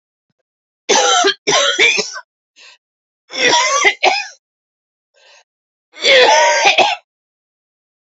{"three_cough_length": "8.1 s", "three_cough_amplitude": 32384, "three_cough_signal_mean_std_ratio": 0.5, "survey_phase": "beta (2021-08-13 to 2022-03-07)", "age": "45-64", "gender": "Female", "wearing_mask": "No", "symptom_cough_any": true, "symptom_runny_or_blocked_nose": true, "symptom_shortness_of_breath": true, "symptom_fatigue": true, "symptom_headache": true, "symptom_change_to_sense_of_smell_or_taste": true, "symptom_loss_of_taste": true, "symptom_onset": "4 days", "smoker_status": "Current smoker (11 or more cigarettes per day)", "respiratory_condition_asthma": false, "respiratory_condition_other": false, "recruitment_source": "Test and Trace", "submission_delay": "2 days", "covid_test_result": "Positive", "covid_test_method": "RT-qPCR", "covid_ct_value": 14.0, "covid_ct_gene": "ORF1ab gene", "covid_ct_mean": 14.4, "covid_viral_load": "19000000 copies/ml", "covid_viral_load_category": "High viral load (>1M copies/ml)"}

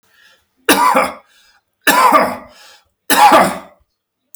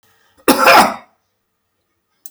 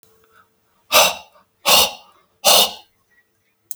{"three_cough_length": "4.4 s", "three_cough_amplitude": 32768, "three_cough_signal_mean_std_ratio": 0.47, "cough_length": "2.3 s", "cough_amplitude": 32768, "cough_signal_mean_std_ratio": 0.36, "exhalation_length": "3.8 s", "exhalation_amplitude": 32768, "exhalation_signal_mean_std_ratio": 0.35, "survey_phase": "beta (2021-08-13 to 2022-03-07)", "age": "45-64", "gender": "Male", "wearing_mask": "No", "symptom_none": true, "smoker_status": "Never smoked", "respiratory_condition_asthma": false, "respiratory_condition_other": false, "recruitment_source": "REACT", "submission_delay": "2 days", "covid_test_result": "Negative", "covid_test_method": "RT-qPCR", "influenza_a_test_result": "Negative", "influenza_b_test_result": "Negative"}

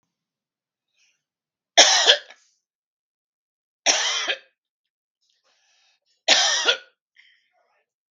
{"three_cough_length": "8.1 s", "three_cough_amplitude": 32768, "three_cough_signal_mean_std_ratio": 0.29, "survey_phase": "beta (2021-08-13 to 2022-03-07)", "age": "45-64", "gender": "Male", "wearing_mask": "No", "symptom_none": true, "smoker_status": "Never smoked", "respiratory_condition_asthma": false, "respiratory_condition_other": false, "recruitment_source": "REACT", "submission_delay": "0 days", "covid_test_result": "Negative", "covid_test_method": "RT-qPCR", "influenza_a_test_result": "Negative", "influenza_b_test_result": "Negative"}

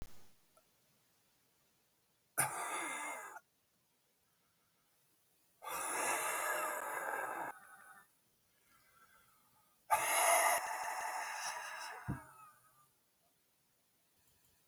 {"exhalation_length": "14.7 s", "exhalation_amplitude": 4012, "exhalation_signal_mean_std_ratio": 0.46, "survey_phase": "beta (2021-08-13 to 2022-03-07)", "age": "65+", "gender": "Male", "wearing_mask": "No", "symptom_cough_any": true, "symptom_runny_or_blocked_nose": true, "symptom_shortness_of_breath": true, "symptom_fatigue": true, "symptom_headache": true, "symptom_other": true, "symptom_onset": "10 days", "smoker_status": "Current smoker (1 to 10 cigarettes per day)", "respiratory_condition_asthma": false, "respiratory_condition_other": true, "recruitment_source": "REACT", "submission_delay": "1 day", "covid_test_result": "Negative", "covid_test_method": "RT-qPCR"}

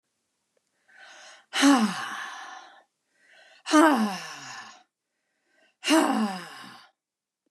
{"exhalation_length": "7.5 s", "exhalation_amplitude": 20244, "exhalation_signal_mean_std_ratio": 0.38, "survey_phase": "beta (2021-08-13 to 2022-03-07)", "age": "65+", "gender": "Female", "wearing_mask": "No", "symptom_none": true, "smoker_status": "Never smoked", "respiratory_condition_asthma": false, "respiratory_condition_other": false, "recruitment_source": "REACT", "submission_delay": "3 days", "covid_test_result": "Negative", "covid_test_method": "RT-qPCR", "influenza_a_test_result": "Negative", "influenza_b_test_result": "Negative"}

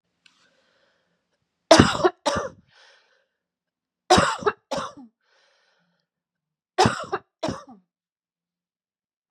{"three_cough_length": "9.3 s", "three_cough_amplitude": 32768, "three_cough_signal_mean_std_ratio": 0.26, "survey_phase": "beta (2021-08-13 to 2022-03-07)", "age": "45-64", "gender": "Female", "wearing_mask": "No", "symptom_cough_any": true, "symptom_runny_or_blocked_nose": true, "symptom_fatigue": true, "symptom_headache": true, "symptom_onset": "3 days", "smoker_status": "Never smoked", "respiratory_condition_asthma": false, "respiratory_condition_other": false, "recruitment_source": "Test and Trace", "submission_delay": "2 days", "covid_test_result": "Positive", "covid_test_method": "RT-qPCR", "covid_ct_value": 19.1, "covid_ct_gene": "ORF1ab gene", "covid_ct_mean": 19.7, "covid_viral_load": "330000 copies/ml", "covid_viral_load_category": "Low viral load (10K-1M copies/ml)"}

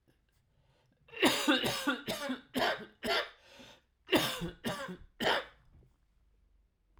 {"cough_length": "7.0 s", "cough_amplitude": 7948, "cough_signal_mean_std_ratio": 0.47, "survey_phase": "alpha (2021-03-01 to 2021-08-12)", "age": "45-64", "gender": "Male", "wearing_mask": "No", "symptom_cough_any": true, "symptom_fever_high_temperature": true, "symptom_change_to_sense_of_smell_or_taste": true, "symptom_loss_of_taste": true, "symptom_onset": "4 days", "smoker_status": "Never smoked", "respiratory_condition_asthma": false, "respiratory_condition_other": false, "recruitment_source": "Test and Trace", "submission_delay": "1 day", "covid_test_result": "Positive", "covid_test_method": "RT-qPCR", "covid_ct_value": 13.0, "covid_ct_gene": "N gene", "covid_ct_mean": 13.6, "covid_viral_load": "35000000 copies/ml", "covid_viral_load_category": "High viral load (>1M copies/ml)"}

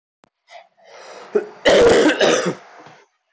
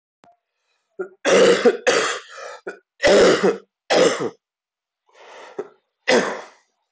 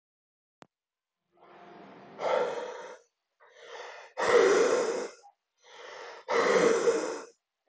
{"cough_length": "3.3 s", "cough_amplitude": 23975, "cough_signal_mean_std_ratio": 0.48, "three_cough_length": "6.9 s", "three_cough_amplitude": 19660, "three_cough_signal_mean_std_ratio": 0.46, "exhalation_length": "7.7 s", "exhalation_amplitude": 8918, "exhalation_signal_mean_std_ratio": 0.48, "survey_phase": "alpha (2021-03-01 to 2021-08-12)", "age": "18-44", "gender": "Male", "wearing_mask": "No", "symptom_cough_any": true, "symptom_new_continuous_cough": true, "symptom_diarrhoea": true, "symptom_fatigue": true, "symptom_fever_high_temperature": true, "symptom_headache": true, "symptom_change_to_sense_of_smell_or_taste": true, "symptom_loss_of_taste": true, "symptom_onset": "5 days", "smoker_status": "Ex-smoker", "respiratory_condition_asthma": false, "respiratory_condition_other": false, "recruitment_source": "Test and Trace", "submission_delay": "1 day", "covid_test_result": "Positive", "covid_test_method": "RT-qPCR", "covid_ct_value": 18.2, "covid_ct_gene": "ORF1ab gene"}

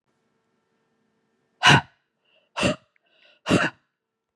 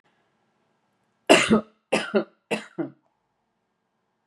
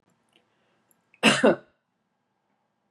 {"exhalation_length": "4.4 s", "exhalation_amplitude": 28691, "exhalation_signal_mean_std_ratio": 0.26, "three_cough_length": "4.3 s", "three_cough_amplitude": 26664, "three_cough_signal_mean_std_ratio": 0.28, "cough_length": "2.9 s", "cough_amplitude": 23951, "cough_signal_mean_std_ratio": 0.24, "survey_phase": "beta (2021-08-13 to 2022-03-07)", "age": "45-64", "gender": "Female", "wearing_mask": "No", "symptom_none": true, "smoker_status": "Ex-smoker", "respiratory_condition_asthma": false, "respiratory_condition_other": false, "recruitment_source": "REACT", "submission_delay": "1 day", "covid_test_result": "Negative", "covid_test_method": "RT-qPCR", "influenza_a_test_result": "Negative", "influenza_b_test_result": "Negative"}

